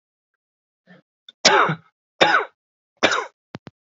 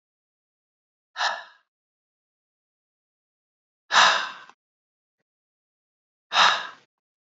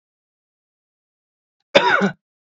{"three_cough_length": "3.8 s", "three_cough_amplitude": 31852, "three_cough_signal_mean_std_ratio": 0.34, "exhalation_length": "7.3 s", "exhalation_amplitude": 26554, "exhalation_signal_mean_std_ratio": 0.25, "cough_length": "2.5 s", "cough_amplitude": 27955, "cough_signal_mean_std_ratio": 0.28, "survey_phase": "beta (2021-08-13 to 2022-03-07)", "age": "18-44", "gender": "Male", "wearing_mask": "No", "symptom_cough_any": true, "symptom_runny_or_blocked_nose": true, "symptom_sore_throat": true, "symptom_fatigue": true, "symptom_headache": true, "smoker_status": "Never smoked", "respiratory_condition_asthma": false, "respiratory_condition_other": false, "recruitment_source": "Test and Trace", "submission_delay": "1 day", "covid_test_result": "Positive", "covid_test_method": "RT-qPCR", "covid_ct_value": 15.9, "covid_ct_gene": "ORF1ab gene", "covid_ct_mean": 16.2, "covid_viral_load": "4800000 copies/ml", "covid_viral_load_category": "High viral load (>1M copies/ml)"}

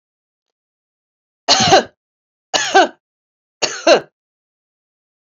{"three_cough_length": "5.3 s", "three_cough_amplitude": 29946, "three_cough_signal_mean_std_ratio": 0.31, "survey_phase": "beta (2021-08-13 to 2022-03-07)", "age": "45-64", "gender": "Female", "wearing_mask": "No", "symptom_none": true, "smoker_status": "Ex-smoker", "respiratory_condition_asthma": false, "respiratory_condition_other": false, "recruitment_source": "REACT", "submission_delay": "2 days", "covid_test_result": "Negative", "covid_test_method": "RT-qPCR"}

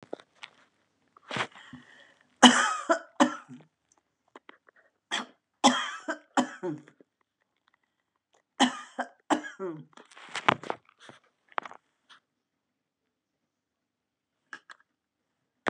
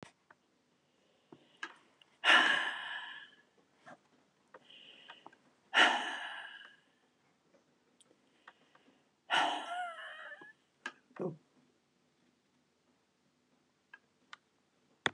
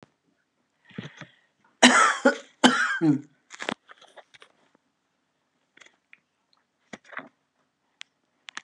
{"three_cough_length": "15.7 s", "three_cough_amplitude": 30558, "three_cough_signal_mean_std_ratio": 0.24, "exhalation_length": "15.1 s", "exhalation_amplitude": 10108, "exhalation_signal_mean_std_ratio": 0.28, "cough_length": "8.6 s", "cough_amplitude": 29802, "cough_signal_mean_std_ratio": 0.27, "survey_phase": "beta (2021-08-13 to 2022-03-07)", "age": "65+", "gender": "Female", "wearing_mask": "No", "symptom_none": true, "smoker_status": "Ex-smoker", "respiratory_condition_asthma": false, "respiratory_condition_other": false, "recruitment_source": "REACT", "submission_delay": "3 days", "covid_test_result": "Negative", "covid_test_method": "RT-qPCR"}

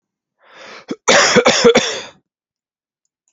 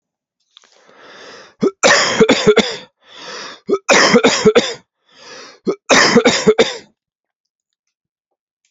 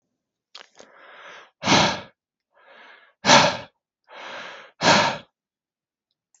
{"cough_length": "3.3 s", "cough_amplitude": 32768, "cough_signal_mean_std_ratio": 0.41, "three_cough_length": "8.7 s", "three_cough_amplitude": 32768, "three_cough_signal_mean_std_ratio": 0.45, "exhalation_length": "6.4 s", "exhalation_amplitude": 32234, "exhalation_signal_mean_std_ratio": 0.32, "survey_phase": "beta (2021-08-13 to 2022-03-07)", "age": "45-64", "gender": "Male", "wearing_mask": "No", "symptom_none": true, "smoker_status": "Never smoked", "respiratory_condition_asthma": false, "respiratory_condition_other": false, "recruitment_source": "REACT", "submission_delay": "2 days", "covid_test_result": "Negative", "covid_test_method": "RT-qPCR", "influenza_a_test_result": "Negative", "influenza_b_test_result": "Negative"}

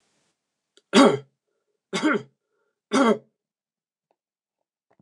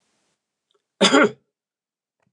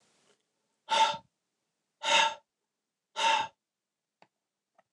{"three_cough_length": "5.0 s", "three_cough_amplitude": 26388, "three_cough_signal_mean_std_ratio": 0.28, "cough_length": "2.3 s", "cough_amplitude": 26977, "cough_signal_mean_std_ratio": 0.27, "exhalation_length": "4.9 s", "exhalation_amplitude": 8407, "exhalation_signal_mean_std_ratio": 0.33, "survey_phase": "beta (2021-08-13 to 2022-03-07)", "age": "45-64", "gender": "Male", "wearing_mask": "No", "symptom_none": true, "smoker_status": "Ex-smoker", "respiratory_condition_asthma": false, "respiratory_condition_other": false, "recruitment_source": "REACT", "submission_delay": "1 day", "covid_test_result": "Negative", "covid_test_method": "RT-qPCR", "influenza_a_test_result": "Negative", "influenza_b_test_result": "Negative"}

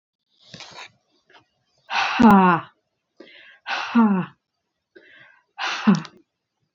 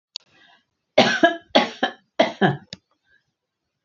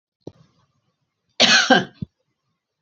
{"exhalation_length": "6.7 s", "exhalation_amplitude": 26380, "exhalation_signal_mean_std_ratio": 0.36, "three_cough_length": "3.8 s", "three_cough_amplitude": 28456, "three_cough_signal_mean_std_ratio": 0.34, "cough_length": "2.8 s", "cough_amplitude": 31886, "cough_signal_mean_std_ratio": 0.31, "survey_phase": "beta (2021-08-13 to 2022-03-07)", "age": "65+", "gender": "Female", "wearing_mask": "No", "symptom_none": true, "smoker_status": "Never smoked", "respiratory_condition_asthma": false, "respiratory_condition_other": false, "recruitment_source": "REACT", "submission_delay": "2 days", "covid_test_result": "Negative", "covid_test_method": "RT-qPCR", "influenza_a_test_result": "Negative", "influenza_b_test_result": "Negative"}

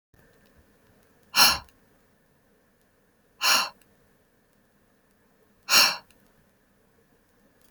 {"exhalation_length": "7.7 s", "exhalation_amplitude": 22106, "exhalation_signal_mean_std_ratio": 0.24, "survey_phase": "beta (2021-08-13 to 2022-03-07)", "age": "18-44", "gender": "Female", "wearing_mask": "No", "symptom_none": true, "smoker_status": "Never smoked", "respiratory_condition_asthma": false, "respiratory_condition_other": false, "recruitment_source": "REACT", "submission_delay": "11 days", "covid_test_result": "Negative", "covid_test_method": "RT-qPCR"}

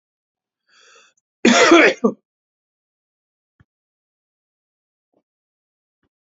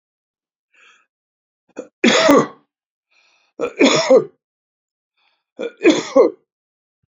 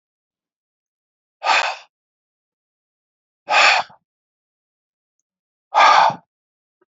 {"cough_length": "6.2 s", "cough_amplitude": 29893, "cough_signal_mean_std_ratio": 0.24, "three_cough_length": "7.2 s", "three_cough_amplitude": 29377, "three_cough_signal_mean_std_ratio": 0.34, "exhalation_length": "7.0 s", "exhalation_amplitude": 28249, "exhalation_signal_mean_std_ratio": 0.3, "survey_phase": "beta (2021-08-13 to 2022-03-07)", "age": "65+", "gender": "Male", "wearing_mask": "No", "symptom_none": true, "smoker_status": "Ex-smoker", "respiratory_condition_asthma": false, "respiratory_condition_other": false, "recruitment_source": "REACT", "submission_delay": "1 day", "covid_test_result": "Negative", "covid_test_method": "RT-qPCR", "influenza_a_test_result": "Negative", "influenza_b_test_result": "Negative"}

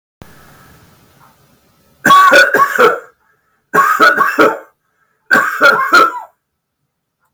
{"three_cough_length": "7.3 s", "three_cough_amplitude": 32768, "three_cough_signal_mean_std_ratio": 0.5, "survey_phase": "beta (2021-08-13 to 2022-03-07)", "age": "65+", "gender": "Male", "wearing_mask": "No", "symptom_none": true, "smoker_status": "Never smoked", "respiratory_condition_asthma": true, "respiratory_condition_other": false, "recruitment_source": "REACT", "submission_delay": "2 days", "covid_test_result": "Negative", "covid_test_method": "RT-qPCR", "influenza_a_test_result": "Negative", "influenza_b_test_result": "Negative"}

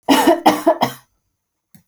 {"cough_length": "1.9 s", "cough_amplitude": 29662, "cough_signal_mean_std_ratio": 0.47, "survey_phase": "alpha (2021-03-01 to 2021-08-12)", "age": "45-64", "gender": "Female", "wearing_mask": "No", "symptom_none": true, "smoker_status": "Never smoked", "respiratory_condition_asthma": false, "respiratory_condition_other": false, "recruitment_source": "REACT", "submission_delay": "2 days", "covid_test_result": "Negative", "covid_test_method": "RT-qPCR"}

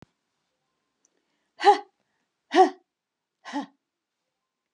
{"exhalation_length": "4.7 s", "exhalation_amplitude": 19545, "exhalation_signal_mean_std_ratio": 0.21, "survey_phase": "alpha (2021-03-01 to 2021-08-12)", "age": "65+", "gender": "Female", "wearing_mask": "No", "symptom_none": true, "smoker_status": "Never smoked", "respiratory_condition_asthma": false, "respiratory_condition_other": false, "recruitment_source": "REACT", "submission_delay": "2 days", "covid_test_result": "Negative", "covid_test_method": "RT-qPCR"}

